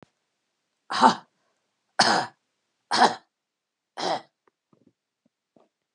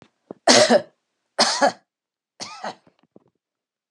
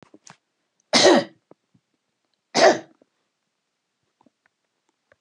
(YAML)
exhalation_length: 5.9 s
exhalation_amplitude: 27579
exhalation_signal_mean_std_ratio: 0.28
three_cough_length: 3.9 s
three_cough_amplitude: 29507
three_cough_signal_mean_std_ratio: 0.33
cough_length: 5.2 s
cough_amplitude: 26569
cough_signal_mean_std_ratio: 0.25
survey_phase: beta (2021-08-13 to 2022-03-07)
age: 45-64
gender: Female
wearing_mask: 'No'
symptom_fatigue: true
smoker_status: Ex-smoker
respiratory_condition_asthma: false
respiratory_condition_other: false
recruitment_source: REACT
submission_delay: 3 days
covid_test_result: Negative
covid_test_method: RT-qPCR